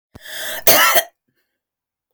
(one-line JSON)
{"cough_length": "2.1 s", "cough_amplitude": 32768, "cough_signal_mean_std_ratio": 0.4, "survey_phase": "beta (2021-08-13 to 2022-03-07)", "age": "65+", "gender": "Female", "wearing_mask": "No", "symptom_none": true, "smoker_status": "Ex-smoker", "respiratory_condition_asthma": false, "respiratory_condition_other": false, "recruitment_source": "REACT", "submission_delay": "2 days", "covid_test_result": "Negative", "covid_test_method": "RT-qPCR", "influenza_a_test_result": "Negative", "influenza_b_test_result": "Negative"}